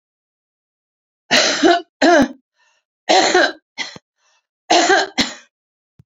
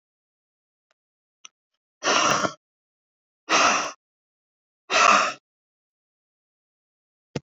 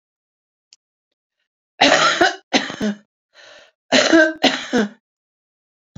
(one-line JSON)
{"three_cough_length": "6.1 s", "three_cough_amplitude": 32768, "three_cough_signal_mean_std_ratio": 0.43, "exhalation_length": "7.4 s", "exhalation_amplitude": 23538, "exhalation_signal_mean_std_ratio": 0.32, "cough_length": "6.0 s", "cough_amplitude": 32262, "cough_signal_mean_std_ratio": 0.39, "survey_phase": "beta (2021-08-13 to 2022-03-07)", "age": "65+", "gender": "Female", "wearing_mask": "No", "symptom_cough_any": true, "smoker_status": "Ex-smoker", "respiratory_condition_asthma": true, "respiratory_condition_other": true, "recruitment_source": "REACT", "submission_delay": "4 days", "covid_test_result": "Negative", "covid_test_method": "RT-qPCR", "influenza_a_test_result": "Negative", "influenza_b_test_result": "Negative"}